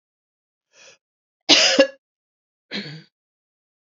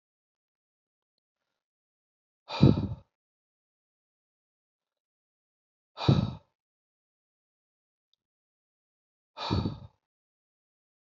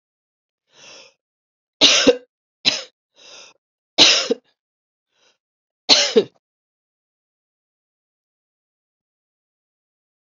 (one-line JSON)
{"cough_length": "3.9 s", "cough_amplitude": 30370, "cough_signal_mean_std_ratio": 0.26, "exhalation_length": "11.2 s", "exhalation_amplitude": 14439, "exhalation_signal_mean_std_ratio": 0.19, "three_cough_length": "10.2 s", "three_cough_amplitude": 32767, "three_cough_signal_mean_std_ratio": 0.24, "survey_phase": "beta (2021-08-13 to 2022-03-07)", "age": "45-64", "gender": "Female", "wearing_mask": "No", "symptom_cough_any": true, "symptom_runny_or_blocked_nose": true, "symptom_headache": true, "symptom_onset": "5 days", "smoker_status": "Never smoked", "respiratory_condition_asthma": false, "respiratory_condition_other": false, "recruitment_source": "Test and Trace", "submission_delay": "1 day", "covid_test_result": "Positive", "covid_test_method": "ePCR"}